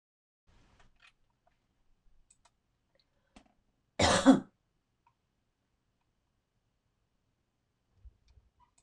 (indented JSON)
{
  "cough_length": "8.8 s",
  "cough_amplitude": 11659,
  "cough_signal_mean_std_ratio": 0.16,
  "survey_phase": "beta (2021-08-13 to 2022-03-07)",
  "age": "65+",
  "gender": "Female",
  "wearing_mask": "No",
  "symptom_none": true,
  "smoker_status": "Ex-smoker",
  "respiratory_condition_asthma": false,
  "respiratory_condition_other": false,
  "recruitment_source": "REACT",
  "submission_delay": "5 days",
  "covid_test_result": "Negative",
  "covid_test_method": "RT-qPCR"
}